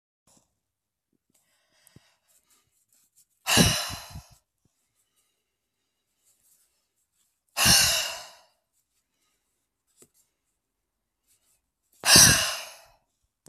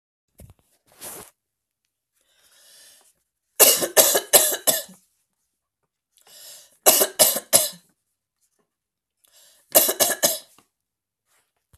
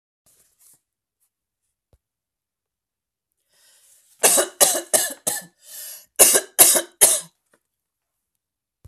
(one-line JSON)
{"exhalation_length": "13.5 s", "exhalation_amplitude": 31856, "exhalation_signal_mean_std_ratio": 0.24, "three_cough_length": "11.8 s", "three_cough_amplitude": 32768, "three_cough_signal_mean_std_ratio": 0.3, "cough_length": "8.9 s", "cough_amplitude": 32768, "cough_signal_mean_std_ratio": 0.29, "survey_phase": "beta (2021-08-13 to 2022-03-07)", "age": "18-44", "gender": "Female", "wearing_mask": "No", "symptom_none": true, "smoker_status": "Never smoked", "respiratory_condition_asthma": false, "respiratory_condition_other": false, "recruitment_source": "Test and Trace", "submission_delay": "1 day", "covid_test_result": "Negative", "covid_test_method": "RT-qPCR"}